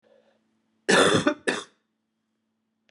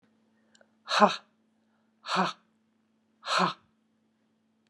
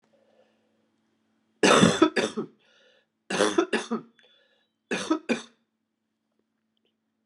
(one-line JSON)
{"cough_length": "2.9 s", "cough_amplitude": 17352, "cough_signal_mean_std_ratio": 0.34, "exhalation_length": "4.7 s", "exhalation_amplitude": 18521, "exhalation_signal_mean_std_ratio": 0.28, "three_cough_length": "7.3 s", "three_cough_amplitude": 21014, "three_cough_signal_mean_std_ratio": 0.32, "survey_phase": "beta (2021-08-13 to 2022-03-07)", "age": "45-64", "gender": "Female", "wearing_mask": "No", "symptom_runny_or_blocked_nose": true, "symptom_fever_high_temperature": true, "symptom_change_to_sense_of_smell_or_taste": true, "symptom_loss_of_taste": true, "symptom_onset": "4 days", "smoker_status": "Never smoked", "respiratory_condition_asthma": false, "respiratory_condition_other": false, "recruitment_source": "Test and Trace", "submission_delay": "1 day", "covid_test_result": "Positive", "covid_test_method": "ePCR"}